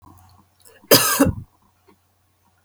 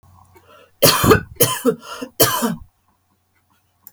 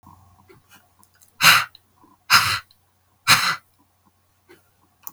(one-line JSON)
{"cough_length": "2.6 s", "cough_amplitude": 32768, "cough_signal_mean_std_ratio": 0.31, "three_cough_length": "3.9 s", "three_cough_amplitude": 32768, "three_cough_signal_mean_std_ratio": 0.4, "exhalation_length": "5.1 s", "exhalation_amplitude": 32768, "exhalation_signal_mean_std_ratio": 0.3, "survey_phase": "beta (2021-08-13 to 2022-03-07)", "age": "45-64", "gender": "Female", "wearing_mask": "No", "symptom_none": true, "smoker_status": "Never smoked", "respiratory_condition_asthma": false, "respiratory_condition_other": false, "recruitment_source": "REACT", "submission_delay": "1 day", "covid_test_result": "Negative", "covid_test_method": "RT-qPCR", "influenza_a_test_result": "Negative", "influenza_b_test_result": "Negative"}